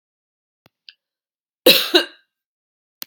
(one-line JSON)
{"cough_length": "3.1 s", "cough_amplitude": 32768, "cough_signal_mean_std_ratio": 0.23, "survey_phase": "beta (2021-08-13 to 2022-03-07)", "age": "45-64", "gender": "Female", "wearing_mask": "No", "symptom_none": true, "smoker_status": "Never smoked", "respiratory_condition_asthma": false, "respiratory_condition_other": false, "recruitment_source": "REACT", "submission_delay": "1 day", "covid_test_result": "Negative", "covid_test_method": "RT-qPCR"}